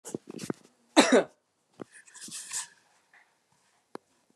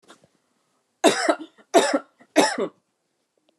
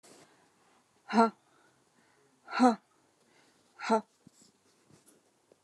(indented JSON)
{
  "cough_length": "4.4 s",
  "cough_amplitude": 27350,
  "cough_signal_mean_std_ratio": 0.24,
  "three_cough_length": "3.6 s",
  "three_cough_amplitude": 28588,
  "three_cough_signal_mean_std_ratio": 0.35,
  "exhalation_length": "5.6 s",
  "exhalation_amplitude": 11144,
  "exhalation_signal_mean_std_ratio": 0.24,
  "survey_phase": "alpha (2021-03-01 to 2021-08-12)",
  "age": "18-44",
  "gender": "Female",
  "wearing_mask": "No",
  "symptom_none": true,
  "smoker_status": "Never smoked",
  "respiratory_condition_asthma": false,
  "respiratory_condition_other": false,
  "recruitment_source": "REACT",
  "submission_delay": "2 days",
  "covid_test_result": "Negative",
  "covid_test_method": "RT-qPCR"
}